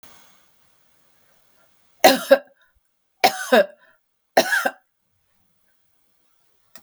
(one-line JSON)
{"three_cough_length": "6.8 s", "three_cough_amplitude": 32768, "three_cough_signal_mean_std_ratio": 0.25, "survey_phase": "beta (2021-08-13 to 2022-03-07)", "age": "65+", "gender": "Female", "wearing_mask": "No", "symptom_none": true, "smoker_status": "Ex-smoker", "respiratory_condition_asthma": false, "respiratory_condition_other": false, "recruitment_source": "REACT", "submission_delay": "8 days", "covid_test_result": "Negative", "covid_test_method": "RT-qPCR"}